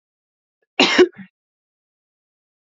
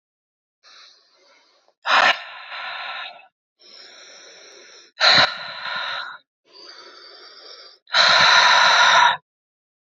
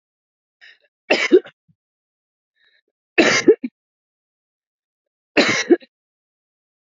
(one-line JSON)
{"cough_length": "2.7 s", "cough_amplitude": 29528, "cough_signal_mean_std_ratio": 0.24, "exhalation_length": "9.8 s", "exhalation_amplitude": 26948, "exhalation_signal_mean_std_ratio": 0.43, "three_cough_length": "6.9 s", "three_cough_amplitude": 27809, "three_cough_signal_mean_std_ratio": 0.27, "survey_phase": "beta (2021-08-13 to 2022-03-07)", "age": "18-44", "gender": "Female", "wearing_mask": "No", "symptom_runny_or_blocked_nose": true, "symptom_fatigue": true, "symptom_headache": true, "symptom_onset": "4 days", "smoker_status": "Never smoked", "respiratory_condition_asthma": false, "respiratory_condition_other": false, "recruitment_source": "Test and Trace", "submission_delay": "3 days", "covid_test_result": "Positive", "covid_test_method": "RT-qPCR", "covid_ct_value": 23.3, "covid_ct_gene": "ORF1ab gene"}